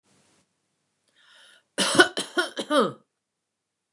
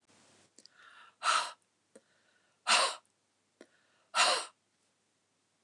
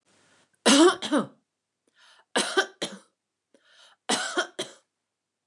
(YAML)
cough_length: 3.9 s
cough_amplitude: 29203
cough_signal_mean_std_ratio: 0.31
exhalation_length: 5.6 s
exhalation_amplitude: 7387
exhalation_signal_mean_std_ratio: 0.3
three_cough_length: 5.5 s
three_cough_amplitude: 17090
three_cough_signal_mean_std_ratio: 0.34
survey_phase: beta (2021-08-13 to 2022-03-07)
age: 65+
gender: Female
wearing_mask: 'No'
symptom_none: true
smoker_status: Never smoked
respiratory_condition_asthma: false
respiratory_condition_other: false
recruitment_source: REACT
submission_delay: 1 day
covid_test_result: Negative
covid_test_method: RT-qPCR
influenza_a_test_result: Negative
influenza_b_test_result: Negative